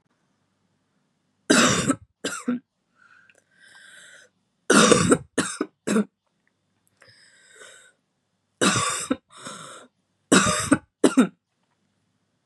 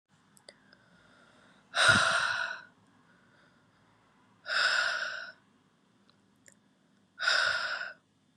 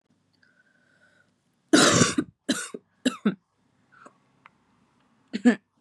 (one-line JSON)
{"three_cough_length": "12.5 s", "three_cough_amplitude": 32272, "three_cough_signal_mean_std_ratio": 0.35, "exhalation_length": "8.4 s", "exhalation_amplitude": 10154, "exhalation_signal_mean_std_ratio": 0.41, "cough_length": "5.8 s", "cough_amplitude": 20452, "cough_signal_mean_std_ratio": 0.3, "survey_phase": "beta (2021-08-13 to 2022-03-07)", "age": "18-44", "gender": "Female", "wearing_mask": "No", "symptom_runny_or_blocked_nose": true, "symptom_shortness_of_breath": true, "symptom_sore_throat": true, "symptom_abdominal_pain": true, "symptom_fatigue": true, "symptom_fever_high_temperature": true, "symptom_headache": true, "smoker_status": "Current smoker (e-cigarettes or vapes only)", "respiratory_condition_asthma": false, "respiratory_condition_other": false, "recruitment_source": "Test and Trace", "submission_delay": "1 day", "covid_test_result": "Positive", "covid_test_method": "LFT"}